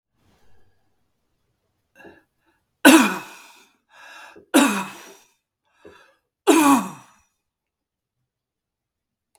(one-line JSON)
{"three_cough_length": "9.4 s", "three_cough_amplitude": 32768, "three_cough_signal_mean_std_ratio": 0.26, "survey_phase": "beta (2021-08-13 to 2022-03-07)", "age": "65+", "gender": "Male", "wearing_mask": "No", "symptom_none": true, "smoker_status": "Never smoked", "respiratory_condition_asthma": false, "respiratory_condition_other": false, "recruitment_source": "REACT", "submission_delay": "0 days", "covid_test_result": "Negative", "covid_test_method": "RT-qPCR"}